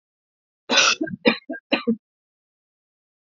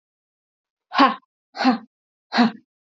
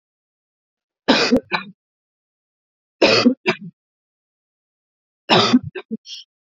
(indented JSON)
{
  "cough_length": "3.3 s",
  "cough_amplitude": 27199,
  "cough_signal_mean_std_ratio": 0.34,
  "exhalation_length": "2.9 s",
  "exhalation_amplitude": 27922,
  "exhalation_signal_mean_std_ratio": 0.34,
  "three_cough_length": "6.5 s",
  "three_cough_amplitude": 32767,
  "three_cough_signal_mean_std_ratio": 0.34,
  "survey_phase": "beta (2021-08-13 to 2022-03-07)",
  "age": "45-64",
  "gender": "Female",
  "wearing_mask": "No",
  "symptom_none": true,
  "smoker_status": "Never smoked",
  "respiratory_condition_asthma": false,
  "respiratory_condition_other": false,
  "recruitment_source": "REACT",
  "submission_delay": "2 days",
  "covid_test_result": "Negative",
  "covid_test_method": "RT-qPCR",
  "influenza_a_test_result": "Negative",
  "influenza_b_test_result": "Negative"
}